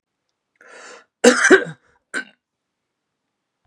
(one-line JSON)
{"cough_length": "3.7 s", "cough_amplitude": 32768, "cough_signal_mean_std_ratio": 0.26, "survey_phase": "beta (2021-08-13 to 2022-03-07)", "age": "45-64", "gender": "Male", "wearing_mask": "No", "symptom_none": true, "smoker_status": "Never smoked", "respiratory_condition_asthma": false, "respiratory_condition_other": false, "recruitment_source": "REACT", "submission_delay": "0 days", "covid_test_result": "Negative", "covid_test_method": "RT-qPCR"}